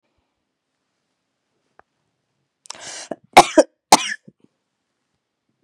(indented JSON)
{
  "cough_length": "5.6 s",
  "cough_amplitude": 32768,
  "cough_signal_mean_std_ratio": 0.16,
  "survey_phase": "beta (2021-08-13 to 2022-03-07)",
  "age": "45-64",
  "gender": "Female",
  "wearing_mask": "No",
  "symptom_cough_any": true,
  "symptom_new_continuous_cough": true,
  "symptom_runny_or_blocked_nose": true,
  "symptom_sore_throat": true,
  "symptom_fatigue": true,
  "symptom_fever_high_temperature": true,
  "symptom_headache": true,
  "symptom_change_to_sense_of_smell_or_taste": true,
  "symptom_other": true,
  "symptom_onset": "2 days",
  "smoker_status": "Never smoked",
  "respiratory_condition_asthma": false,
  "respiratory_condition_other": false,
  "recruitment_source": "Test and Trace",
  "submission_delay": "1 day",
  "covid_test_result": "Positive",
  "covid_test_method": "ePCR"
}